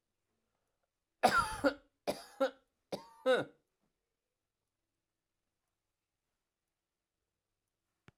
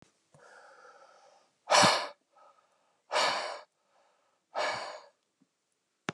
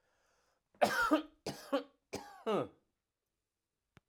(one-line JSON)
{"three_cough_length": "8.2 s", "three_cough_amplitude": 6759, "three_cough_signal_mean_std_ratio": 0.24, "exhalation_length": "6.1 s", "exhalation_amplitude": 10474, "exhalation_signal_mean_std_ratio": 0.32, "cough_length": "4.1 s", "cough_amplitude": 5630, "cough_signal_mean_std_ratio": 0.36, "survey_phase": "alpha (2021-03-01 to 2021-08-12)", "age": "65+", "gender": "Male", "wearing_mask": "No", "symptom_none": true, "smoker_status": "Never smoked", "respiratory_condition_asthma": false, "respiratory_condition_other": false, "recruitment_source": "REACT", "submission_delay": "2 days", "covid_test_result": "Negative", "covid_test_method": "RT-qPCR"}